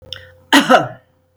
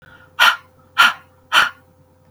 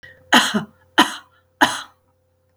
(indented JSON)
{
  "cough_length": "1.4 s",
  "cough_amplitude": 32768,
  "cough_signal_mean_std_ratio": 0.4,
  "exhalation_length": "2.3 s",
  "exhalation_amplitude": 32768,
  "exhalation_signal_mean_std_ratio": 0.37,
  "three_cough_length": "2.6 s",
  "three_cough_amplitude": 32768,
  "three_cough_signal_mean_std_ratio": 0.34,
  "survey_phase": "beta (2021-08-13 to 2022-03-07)",
  "age": "65+",
  "gender": "Female",
  "wearing_mask": "No",
  "symptom_none": true,
  "smoker_status": "Never smoked",
  "respiratory_condition_asthma": false,
  "respiratory_condition_other": false,
  "recruitment_source": "REACT",
  "submission_delay": "2 days",
  "covid_test_result": "Negative",
  "covid_test_method": "RT-qPCR",
  "influenza_a_test_result": "Negative",
  "influenza_b_test_result": "Negative"
}